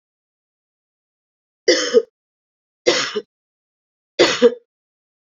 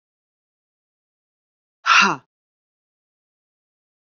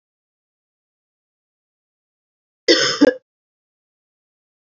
{"three_cough_length": "5.3 s", "three_cough_amplitude": 29495, "three_cough_signal_mean_std_ratio": 0.3, "exhalation_length": "4.0 s", "exhalation_amplitude": 27547, "exhalation_signal_mean_std_ratio": 0.2, "cough_length": "4.6 s", "cough_amplitude": 29455, "cough_signal_mean_std_ratio": 0.21, "survey_phase": "beta (2021-08-13 to 2022-03-07)", "age": "45-64", "gender": "Female", "wearing_mask": "No", "symptom_cough_any": true, "symptom_runny_or_blocked_nose": true, "symptom_sore_throat": true, "symptom_onset": "4 days", "smoker_status": "Ex-smoker", "respiratory_condition_asthma": false, "respiratory_condition_other": false, "recruitment_source": "Test and Trace", "submission_delay": "2 days", "covid_test_result": "Positive", "covid_test_method": "RT-qPCR", "covid_ct_value": 36.3, "covid_ct_gene": "N gene"}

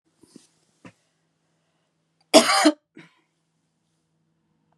{"cough_length": "4.8 s", "cough_amplitude": 32766, "cough_signal_mean_std_ratio": 0.21, "survey_phase": "beta (2021-08-13 to 2022-03-07)", "age": "18-44", "gender": "Female", "wearing_mask": "No", "symptom_headache": true, "smoker_status": "Current smoker (e-cigarettes or vapes only)", "respiratory_condition_asthma": false, "respiratory_condition_other": false, "recruitment_source": "Test and Trace", "submission_delay": "0 days", "covid_test_result": "Negative", "covid_test_method": "LFT"}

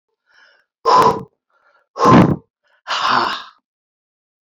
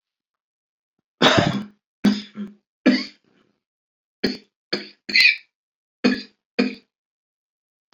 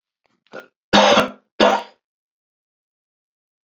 {"exhalation_length": "4.4 s", "exhalation_amplitude": 28638, "exhalation_signal_mean_std_ratio": 0.4, "three_cough_length": "7.9 s", "three_cough_amplitude": 26767, "three_cough_signal_mean_std_ratio": 0.33, "cough_length": "3.7 s", "cough_amplitude": 28796, "cough_signal_mean_std_ratio": 0.31, "survey_phase": "beta (2021-08-13 to 2022-03-07)", "age": "65+", "gender": "Male", "wearing_mask": "No", "symptom_cough_any": true, "symptom_runny_or_blocked_nose": true, "symptom_fatigue": true, "smoker_status": "Ex-smoker", "respiratory_condition_asthma": false, "respiratory_condition_other": false, "recruitment_source": "Test and Trace", "submission_delay": "2 days", "covid_test_result": "Positive", "covid_test_method": "RT-qPCR", "covid_ct_value": 33.5, "covid_ct_gene": "S gene", "covid_ct_mean": 34.1, "covid_viral_load": "6.6 copies/ml", "covid_viral_load_category": "Minimal viral load (< 10K copies/ml)"}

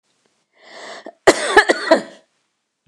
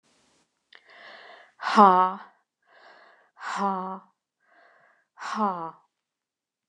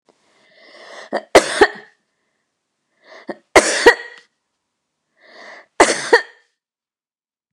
{"cough_length": "2.9 s", "cough_amplitude": 29204, "cough_signal_mean_std_ratio": 0.33, "exhalation_length": "6.7 s", "exhalation_amplitude": 24937, "exhalation_signal_mean_std_ratio": 0.27, "three_cough_length": "7.5 s", "three_cough_amplitude": 29204, "three_cough_signal_mean_std_ratio": 0.27, "survey_phase": "beta (2021-08-13 to 2022-03-07)", "age": "65+", "gender": "Female", "wearing_mask": "No", "symptom_none": true, "smoker_status": "Never smoked", "respiratory_condition_asthma": false, "respiratory_condition_other": false, "recruitment_source": "REACT", "submission_delay": "2 days", "covid_test_result": "Negative", "covid_test_method": "RT-qPCR"}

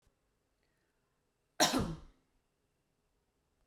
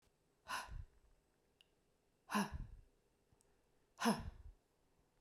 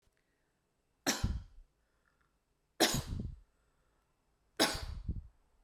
{"cough_length": "3.7 s", "cough_amplitude": 6559, "cough_signal_mean_std_ratio": 0.23, "exhalation_length": "5.2 s", "exhalation_amplitude": 2132, "exhalation_signal_mean_std_ratio": 0.32, "three_cough_length": "5.6 s", "three_cough_amplitude": 7136, "three_cough_signal_mean_std_ratio": 0.35, "survey_phase": "alpha (2021-03-01 to 2021-08-12)", "age": "45-64", "gender": "Female", "wearing_mask": "No", "symptom_headache": true, "smoker_status": "Never smoked", "respiratory_condition_asthma": false, "respiratory_condition_other": false, "recruitment_source": "Test and Trace", "submission_delay": "2 days", "covid_test_result": "Positive", "covid_test_method": "RT-qPCR", "covid_ct_value": 22.1, "covid_ct_gene": "ORF1ab gene"}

